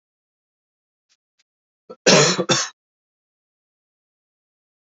cough_length: 4.9 s
cough_amplitude: 32767
cough_signal_mean_std_ratio: 0.25
survey_phase: beta (2021-08-13 to 2022-03-07)
age: 18-44
gender: Male
wearing_mask: 'No'
symptom_cough_any: true
symptom_runny_or_blocked_nose: true
symptom_sore_throat: true
symptom_onset: 3 days
smoker_status: Ex-smoker
respiratory_condition_asthma: false
respiratory_condition_other: false
recruitment_source: Test and Trace
submission_delay: 1 day
covid_test_result: Positive
covid_test_method: RT-qPCR
covid_ct_value: 22.1
covid_ct_gene: ORF1ab gene
covid_ct_mean: 22.6
covid_viral_load: 38000 copies/ml
covid_viral_load_category: Low viral load (10K-1M copies/ml)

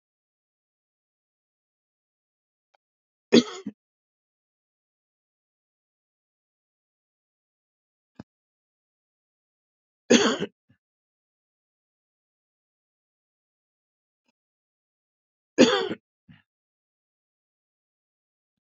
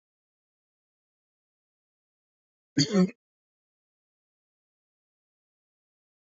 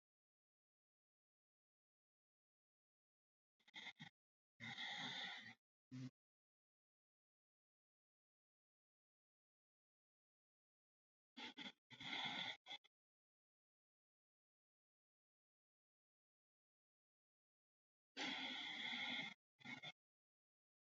three_cough_length: 18.6 s
three_cough_amplitude: 22673
three_cough_signal_mean_std_ratio: 0.14
cough_length: 6.3 s
cough_amplitude: 9223
cough_signal_mean_std_ratio: 0.16
exhalation_length: 21.0 s
exhalation_amplitude: 558
exhalation_signal_mean_std_ratio: 0.33
survey_phase: beta (2021-08-13 to 2022-03-07)
age: 65+
gender: Male
wearing_mask: 'No'
symptom_none: true
smoker_status: Ex-smoker
respiratory_condition_asthma: false
respiratory_condition_other: false
recruitment_source: REACT
submission_delay: 2 days
covid_test_result: Positive
covid_test_method: RT-qPCR
covid_ct_value: 31.0
covid_ct_gene: E gene
influenza_a_test_result: Negative
influenza_b_test_result: Negative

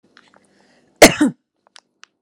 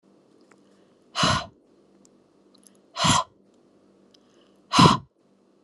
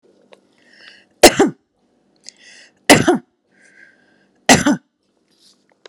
cough_length: 2.2 s
cough_amplitude: 32768
cough_signal_mean_std_ratio: 0.23
exhalation_length: 5.6 s
exhalation_amplitude: 28699
exhalation_signal_mean_std_ratio: 0.28
three_cough_length: 5.9 s
three_cough_amplitude: 32768
three_cough_signal_mean_std_ratio: 0.26
survey_phase: alpha (2021-03-01 to 2021-08-12)
age: 45-64
gender: Female
wearing_mask: 'No'
symptom_none: true
smoker_status: Ex-smoker
respiratory_condition_asthma: false
respiratory_condition_other: false
recruitment_source: REACT
submission_delay: 0 days
covid_test_result: Negative
covid_test_method: RT-qPCR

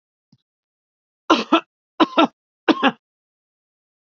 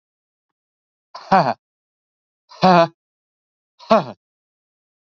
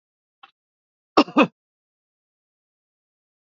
three_cough_length: 4.2 s
three_cough_amplitude: 32767
three_cough_signal_mean_std_ratio: 0.27
exhalation_length: 5.1 s
exhalation_amplitude: 28563
exhalation_signal_mean_std_ratio: 0.26
cough_length: 3.4 s
cough_amplitude: 28707
cough_signal_mean_std_ratio: 0.16
survey_phase: beta (2021-08-13 to 2022-03-07)
age: 65+
gender: Male
wearing_mask: 'No'
symptom_none: true
smoker_status: Never smoked
respiratory_condition_asthma: false
respiratory_condition_other: false
recruitment_source: REACT
submission_delay: 4 days
covid_test_result: Negative
covid_test_method: RT-qPCR
influenza_a_test_result: Negative
influenza_b_test_result: Negative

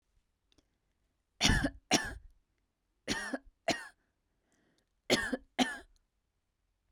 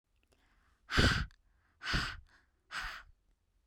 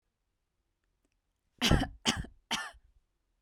three_cough_length: 6.9 s
three_cough_amplitude: 8028
three_cough_signal_mean_std_ratio: 0.32
exhalation_length: 3.7 s
exhalation_amplitude: 7828
exhalation_signal_mean_std_ratio: 0.36
cough_length: 3.4 s
cough_amplitude: 9799
cough_signal_mean_std_ratio: 0.29
survey_phase: beta (2021-08-13 to 2022-03-07)
age: 18-44
gender: Female
wearing_mask: 'No'
symptom_none: true
smoker_status: Ex-smoker
respiratory_condition_asthma: false
respiratory_condition_other: false
recruitment_source: REACT
submission_delay: 3 days
covid_test_result: Negative
covid_test_method: RT-qPCR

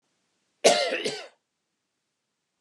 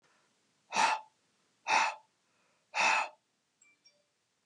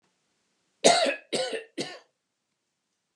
cough_length: 2.6 s
cough_amplitude: 23987
cough_signal_mean_std_ratio: 0.3
exhalation_length: 4.5 s
exhalation_amplitude: 5635
exhalation_signal_mean_std_ratio: 0.36
three_cough_length: 3.2 s
three_cough_amplitude: 21389
three_cough_signal_mean_std_ratio: 0.33
survey_phase: alpha (2021-03-01 to 2021-08-12)
age: 18-44
gender: Male
wearing_mask: 'No'
symptom_none: true
smoker_status: Never smoked
respiratory_condition_asthma: false
respiratory_condition_other: false
recruitment_source: REACT
submission_delay: 2 days
covid_test_result: Negative
covid_test_method: RT-qPCR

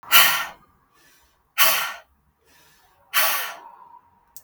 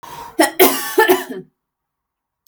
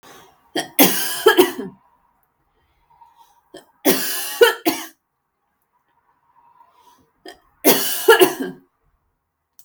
exhalation_length: 4.4 s
exhalation_amplitude: 32768
exhalation_signal_mean_std_ratio: 0.37
cough_length: 2.5 s
cough_amplitude: 32768
cough_signal_mean_std_ratio: 0.43
three_cough_length: 9.6 s
three_cough_amplitude: 32768
three_cough_signal_mean_std_ratio: 0.34
survey_phase: beta (2021-08-13 to 2022-03-07)
age: 18-44
gender: Female
wearing_mask: 'No'
symptom_none: true
smoker_status: Never smoked
respiratory_condition_asthma: false
respiratory_condition_other: false
recruitment_source: REACT
submission_delay: 2 days
covid_test_result: Negative
covid_test_method: RT-qPCR
influenza_a_test_result: Negative
influenza_b_test_result: Negative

